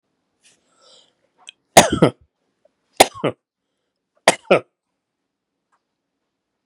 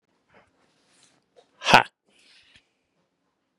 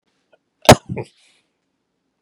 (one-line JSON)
{"three_cough_length": "6.7 s", "three_cough_amplitude": 32768, "three_cough_signal_mean_std_ratio": 0.19, "exhalation_length": "3.6 s", "exhalation_amplitude": 32768, "exhalation_signal_mean_std_ratio": 0.14, "cough_length": "2.2 s", "cough_amplitude": 32768, "cough_signal_mean_std_ratio": 0.17, "survey_phase": "beta (2021-08-13 to 2022-03-07)", "age": "45-64", "gender": "Male", "wearing_mask": "No", "symptom_none": true, "smoker_status": "Never smoked", "respiratory_condition_asthma": false, "respiratory_condition_other": false, "recruitment_source": "REACT", "submission_delay": "1 day", "covid_test_result": "Negative", "covid_test_method": "RT-qPCR", "influenza_a_test_result": "Negative", "influenza_b_test_result": "Negative"}